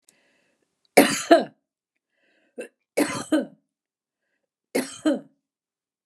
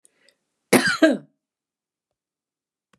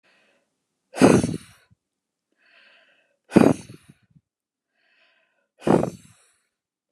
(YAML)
three_cough_length: 6.1 s
three_cough_amplitude: 31483
three_cough_signal_mean_std_ratio: 0.28
cough_length: 3.0 s
cough_amplitude: 27776
cough_signal_mean_std_ratio: 0.27
exhalation_length: 6.9 s
exhalation_amplitude: 32768
exhalation_signal_mean_std_ratio: 0.24
survey_phase: beta (2021-08-13 to 2022-03-07)
age: 45-64
gender: Female
wearing_mask: 'No'
symptom_fatigue: true
symptom_onset: 11 days
smoker_status: Never smoked
respiratory_condition_asthma: false
respiratory_condition_other: false
recruitment_source: REACT
submission_delay: 1 day
covid_test_result: Negative
covid_test_method: RT-qPCR
influenza_a_test_result: Negative
influenza_b_test_result: Negative